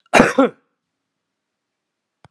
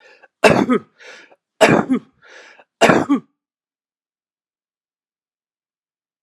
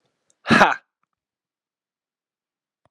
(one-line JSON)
{"cough_length": "2.3 s", "cough_amplitude": 32768, "cough_signal_mean_std_ratio": 0.27, "three_cough_length": "6.2 s", "three_cough_amplitude": 32768, "three_cough_signal_mean_std_ratio": 0.31, "exhalation_length": "2.9 s", "exhalation_amplitude": 32767, "exhalation_signal_mean_std_ratio": 0.21, "survey_phase": "alpha (2021-03-01 to 2021-08-12)", "age": "45-64", "gender": "Male", "wearing_mask": "No", "symptom_cough_any": true, "symptom_fatigue": true, "symptom_headache": true, "symptom_change_to_sense_of_smell_or_taste": true, "symptom_loss_of_taste": true, "symptom_onset": "6 days", "smoker_status": "Ex-smoker", "respiratory_condition_asthma": true, "respiratory_condition_other": false, "recruitment_source": "Test and Trace", "submission_delay": "2 days", "covid_test_result": "Positive", "covid_test_method": "RT-qPCR", "covid_ct_value": 17.7, "covid_ct_gene": "N gene", "covid_ct_mean": 17.9, "covid_viral_load": "1400000 copies/ml", "covid_viral_load_category": "High viral load (>1M copies/ml)"}